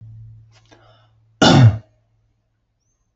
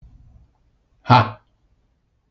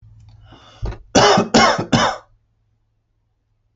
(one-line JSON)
{"cough_length": "3.2 s", "cough_amplitude": 30204, "cough_signal_mean_std_ratio": 0.29, "exhalation_length": "2.3 s", "exhalation_amplitude": 28732, "exhalation_signal_mean_std_ratio": 0.23, "three_cough_length": "3.8 s", "three_cough_amplitude": 29287, "three_cough_signal_mean_std_ratio": 0.41, "survey_phase": "alpha (2021-03-01 to 2021-08-12)", "age": "18-44", "gender": "Male", "wearing_mask": "No", "symptom_none": true, "smoker_status": "Never smoked", "respiratory_condition_asthma": false, "respiratory_condition_other": false, "recruitment_source": "REACT", "submission_delay": "5 days", "covid_test_result": "Negative", "covid_test_method": "RT-qPCR"}